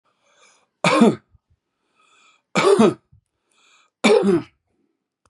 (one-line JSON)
{"three_cough_length": "5.3 s", "three_cough_amplitude": 28327, "three_cough_signal_mean_std_ratio": 0.36, "survey_phase": "beta (2021-08-13 to 2022-03-07)", "age": "65+", "gender": "Male", "wearing_mask": "No", "symptom_sore_throat": true, "symptom_onset": "8 days", "smoker_status": "Ex-smoker", "respiratory_condition_asthma": false, "respiratory_condition_other": false, "recruitment_source": "REACT", "submission_delay": "2 days", "covid_test_result": "Negative", "covid_test_method": "RT-qPCR", "influenza_a_test_result": "Negative", "influenza_b_test_result": "Negative"}